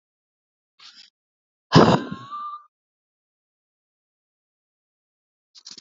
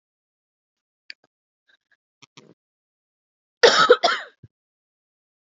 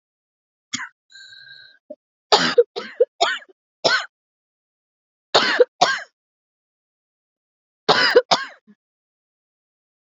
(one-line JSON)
{"exhalation_length": "5.8 s", "exhalation_amplitude": 28066, "exhalation_signal_mean_std_ratio": 0.2, "cough_length": "5.5 s", "cough_amplitude": 30168, "cough_signal_mean_std_ratio": 0.21, "three_cough_length": "10.2 s", "three_cough_amplitude": 32768, "three_cough_signal_mean_std_ratio": 0.3, "survey_phase": "beta (2021-08-13 to 2022-03-07)", "age": "18-44", "gender": "Female", "wearing_mask": "No", "symptom_cough_any": true, "symptom_runny_or_blocked_nose": true, "symptom_sore_throat": true, "symptom_fatigue": true, "symptom_fever_high_temperature": true, "symptom_headache": true, "symptom_change_to_sense_of_smell_or_taste": true, "symptom_onset": "5 days", "smoker_status": "Ex-smoker", "respiratory_condition_asthma": false, "respiratory_condition_other": false, "recruitment_source": "Test and Trace", "submission_delay": "2 days", "covid_test_result": "Positive", "covid_test_method": "RT-qPCR", "covid_ct_value": 18.0, "covid_ct_gene": "N gene", "covid_ct_mean": 18.8, "covid_viral_load": "680000 copies/ml", "covid_viral_load_category": "Low viral load (10K-1M copies/ml)"}